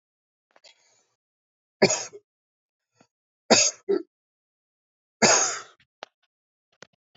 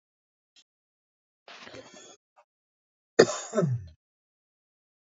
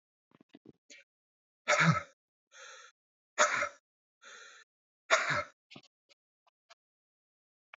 {
  "three_cough_length": "7.2 s",
  "three_cough_amplitude": 25606,
  "three_cough_signal_mean_std_ratio": 0.26,
  "cough_length": "5.0 s",
  "cough_amplitude": 25871,
  "cough_signal_mean_std_ratio": 0.21,
  "exhalation_length": "7.8 s",
  "exhalation_amplitude": 9177,
  "exhalation_signal_mean_std_ratio": 0.28,
  "survey_phase": "beta (2021-08-13 to 2022-03-07)",
  "age": "45-64",
  "gender": "Male",
  "wearing_mask": "No",
  "symptom_none": true,
  "symptom_onset": "12 days",
  "smoker_status": "Never smoked",
  "respiratory_condition_asthma": false,
  "respiratory_condition_other": false,
  "recruitment_source": "REACT",
  "submission_delay": "0 days",
  "covid_test_result": "Negative",
  "covid_test_method": "RT-qPCR"
}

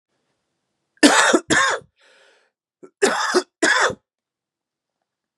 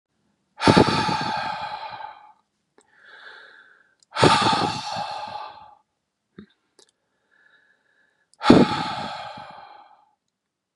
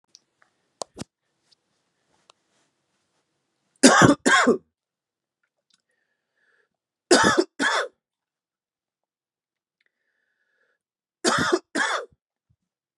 {
  "cough_length": "5.4 s",
  "cough_amplitude": 32768,
  "cough_signal_mean_std_ratio": 0.39,
  "exhalation_length": "10.8 s",
  "exhalation_amplitude": 32768,
  "exhalation_signal_mean_std_ratio": 0.36,
  "three_cough_length": "13.0 s",
  "three_cough_amplitude": 30867,
  "three_cough_signal_mean_std_ratio": 0.27,
  "survey_phase": "beta (2021-08-13 to 2022-03-07)",
  "age": "18-44",
  "gender": "Male",
  "wearing_mask": "No",
  "symptom_sore_throat": true,
  "symptom_change_to_sense_of_smell_or_taste": true,
  "symptom_other": true,
  "symptom_onset": "2 days",
  "smoker_status": "Ex-smoker",
  "respiratory_condition_asthma": false,
  "respiratory_condition_other": false,
  "recruitment_source": "Test and Trace",
  "submission_delay": "1 day",
  "covid_test_result": "Positive",
  "covid_test_method": "RT-qPCR",
  "covid_ct_value": 15.2,
  "covid_ct_gene": "ORF1ab gene",
  "covid_ct_mean": 15.5,
  "covid_viral_load": "8200000 copies/ml",
  "covid_viral_load_category": "High viral load (>1M copies/ml)"
}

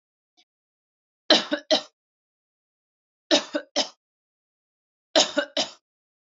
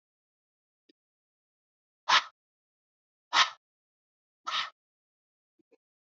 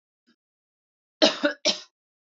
{
  "three_cough_length": "6.2 s",
  "three_cough_amplitude": 25655,
  "three_cough_signal_mean_std_ratio": 0.27,
  "exhalation_length": "6.1 s",
  "exhalation_amplitude": 12692,
  "exhalation_signal_mean_std_ratio": 0.19,
  "cough_length": "2.2 s",
  "cough_amplitude": 19701,
  "cough_signal_mean_std_ratio": 0.28,
  "survey_phase": "beta (2021-08-13 to 2022-03-07)",
  "age": "18-44",
  "gender": "Female",
  "wearing_mask": "No",
  "symptom_none": true,
  "smoker_status": "Never smoked",
  "respiratory_condition_asthma": false,
  "respiratory_condition_other": false,
  "recruitment_source": "REACT",
  "submission_delay": "3 days",
  "covid_test_result": "Negative",
  "covid_test_method": "RT-qPCR",
  "influenza_a_test_result": "Negative",
  "influenza_b_test_result": "Negative"
}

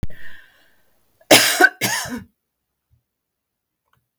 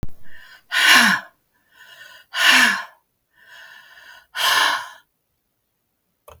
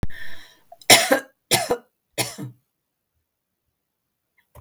{
  "cough_length": "4.2 s",
  "cough_amplitude": 32767,
  "cough_signal_mean_std_ratio": 0.33,
  "exhalation_length": "6.4 s",
  "exhalation_amplitude": 32768,
  "exhalation_signal_mean_std_ratio": 0.42,
  "three_cough_length": "4.6 s",
  "three_cough_amplitude": 32768,
  "three_cough_signal_mean_std_ratio": 0.33,
  "survey_phase": "alpha (2021-03-01 to 2021-08-12)",
  "age": "65+",
  "gender": "Female",
  "wearing_mask": "No",
  "symptom_none": true,
  "smoker_status": "Never smoked",
  "respiratory_condition_asthma": false,
  "respiratory_condition_other": false,
  "recruitment_source": "Test and Trace",
  "submission_delay": "0 days",
  "covid_test_result": "Negative",
  "covid_test_method": "LFT"
}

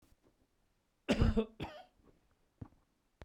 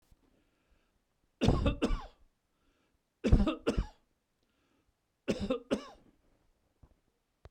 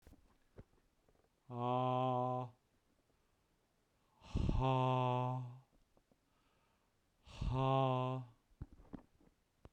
{
  "cough_length": "3.2 s",
  "cough_amplitude": 3812,
  "cough_signal_mean_std_ratio": 0.29,
  "three_cough_length": "7.5 s",
  "three_cough_amplitude": 9147,
  "three_cough_signal_mean_std_ratio": 0.32,
  "exhalation_length": "9.7 s",
  "exhalation_amplitude": 2750,
  "exhalation_signal_mean_std_ratio": 0.5,
  "survey_phase": "beta (2021-08-13 to 2022-03-07)",
  "age": "45-64",
  "gender": "Male",
  "wearing_mask": "No",
  "symptom_none": true,
  "smoker_status": "Ex-smoker",
  "respiratory_condition_asthma": false,
  "respiratory_condition_other": false,
  "recruitment_source": "REACT",
  "submission_delay": "1 day",
  "covid_test_result": "Negative",
  "covid_test_method": "RT-qPCR",
  "influenza_a_test_result": "Negative",
  "influenza_b_test_result": "Negative"
}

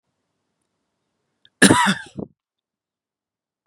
{
  "cough_length": "3.7 s",
  "cough_amplitude": 32767,
  "cough_signal_mean_std_ratio": 0.23,
  "survey_phase": "beta (2021-08-13 to 2022-03-07)",
  "age": "18-44",
  "gender": "Male",
  "wearing_mask": "No",
  "symptom_cough_any": true,
  "symptom_shortness_of_breath": true,
  "symptom_sore_throat": true,
  "symptom_fatigue": true,
  "symptom_onset": "2 days",
  "smoker_status": "Ex-smoker",
  "respiratory_condition_asthma": true,
  "respiratory_condition_other": false,
  "recruitment_source": "Test and Trace",
  "submission_delay": "2 days",
  "covid_test_result": "Positive",
  "covid_test_method": "RT-qPCR",
  "covid_ct_value": 19.3,
  "covid_ct_gene": "ORF1ab gene",
  "covid_ct_mean": 19.7,
  "covid_viral_load": "340000 copies/ml",
  "covid_viral_load_category": "Low viral load (10K-1M copies/ml)"
}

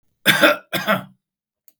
{
  "cough_length": "1.8 s",
  "cough_amplitude": 32768,
  "cough_signal_mean_std_ratio": 0.41,
  "survey_phase": "beta (2021-08-13 to 2022-03-07)",
  "age": "45-64",
  "gender": "Male",
  "wearing_mask": "No",
  "symptom_none": true,
  "smoker_status": "Never smoked",
  "respiratory_condition_asthma": false,
  "respiratory_condition_other": false,
  "recruitment_source": "REACT",
  "submission_delay": "3 days",
  "covid_test_result": "Negative",
  "covid_test_method": "RT-qPCR",
  "influenza_a_test_result": "Unknown/Void",
  "influenza_b_test_result": "Unknown/Void"
}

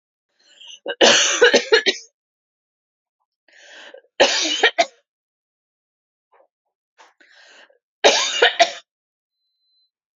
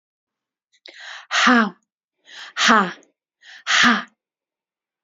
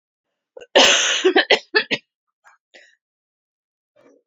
{
  "three_cough_length": "10.2 s",
  "three_cough_amplitude": 32767,
  "three_cough_signal_mean_std_ratio": 0.33,
  "exhalation_length": "5.0 s",
  "exhalation_amplitude": 27884,
  "exhalation_signal_mean_std_ratio": 0.37,
  "cough_length": "4.3 s",
  "cough_amplitude": 29162,
  "cough_signal_mean_std_ratio": 0.35,
  "survey_phase": "beta (2021-08-13 to 2022-03-07)",
  "age": "18-44",
  "gender": "Female",
  "wearing_mask": "No",
  "symptom_cough_any": true,
  "symptom_new_continuous_cough": true,
  "symptom_runny_or_blocked_nose": true,
  "symptom_shortness_of_breath": true,
  "symptom_sore_throat": true,
  "symptom_fatigue": true,
  "symptom_headache": true,
  "symptom_onset": "4 days",
  "smoker_status": "Never smoked",
  "respiratory_condition_asthma": false,
  "respiratory_condition_other": false,
  "recruitment_source": "Test and Trace",
  "submission_delay": "2 days",
  "covid_test_result": "Positive",
  "covid_test_method": "RT-qPCR",
  "covid_ct_value": 29.7,
  "covid_ct_gene": "ORF1ab gene"
}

